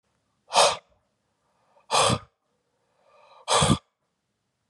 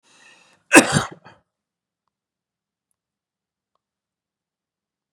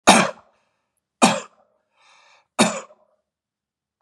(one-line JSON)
{"exhalation_length": "4.7 s", "exhalation_amplitude": 16846, "exhalation_signal_mean_std_ratio": 0.32, "cough_length": "5.1 s", "cough_amplitude": 32768, "cough_signal_mean_std_ratio": 0.16, "three_cough_length": "4.0 s", "three_cough_amplitude": 32768, "three_cough_signal_mean_std_ratio": 0.27, "survey_phase": "beta (2021-08-13 to 2022-03-07)", "age": "45-64", "gender": "Male", "wearing_mask": "No", "symptom_none": true, "smoker_status": "Never smoked", "respiratory_condition_asthma": false, "respiratory_condition_other": false, "recruitment_source": "REACT", "submission_delay": "1 day", "covid_test_result": "Negative", "covid_test_method": "RT-qPCR", "influenza_a_test_result": "Negative", "influenza_b_test_result": "Negative"}